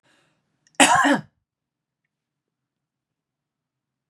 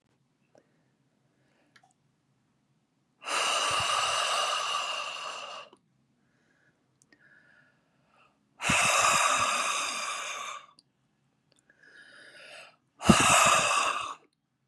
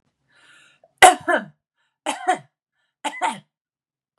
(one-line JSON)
{"cough_length": "4.1 s", "cough_amplitude": 31751, "cough_signal_mean_std_ratio": 0.24, "exhalation_length": "14.7 s", "exhalation_amplitude": 19117, "exhalation_signal_mean_std_ratio": 0.46, "three_cough_length": "4.2 s", "three_cough_amplitude": 32768, "three_cough_signal_mean_std_ratio": 0.25, "survey_phase": "beta (2021-08-13 to 2022-03-07)", "age": "45-64", "gender": "Female", "wearing_mask": "No", "symptom_sore_throat": true, "symptom_onset": "11 days", "smoker_status": "Never smoked", "respiratory_condition_asthma": false, "respiratory_condition_other": false, "recruitment_source": "REACT", "submission_delay": "1 day", "covid_test_result": "Negative", "covid_test_method": "RT-qPCR", "influenza_a_test_result": "Negative", "influenza_b_test_result": "Negative"}